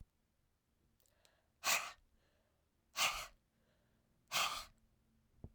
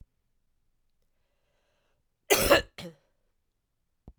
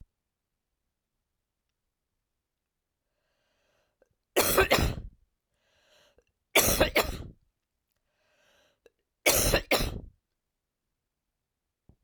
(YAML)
exhalation_length: 5.5 s
exhalation_amplitude: 2754
exhalation_signal_mean_std_ratio: 0.31
cough_length: 4.2 s
cough_amplitude: 16376
cough_signal_mean_std_ratio: 0.22
three_cough_length: 12.0 s
three_cough_amplitude: 13925
three_cough_signal_mean_std_ratio: 0.29
survey_phase: beta (2021-08-13 to 2022-03-07)
age: 65+
gender: Female
wearing_mask: 'No'
symptom_cough_any: true
symptom_runny_or_blocked_nose: true
symptom_fever_high_temperature: true
symptom_headache: true
symptom_change_to_sense_of_smell_or_taste: true
symptom_onset: 3 days
smoker_status: Never smoked
respiratory_condition_asthma: false
respiratory_condition_other: false
recruitment_source: Test and Trace
submission_delay: 2 days
covid_test_result: Positive
covid_test_method: RT-qPCR
covid_ct_value: 32.3
covid_ct_gene: ORF1ab gene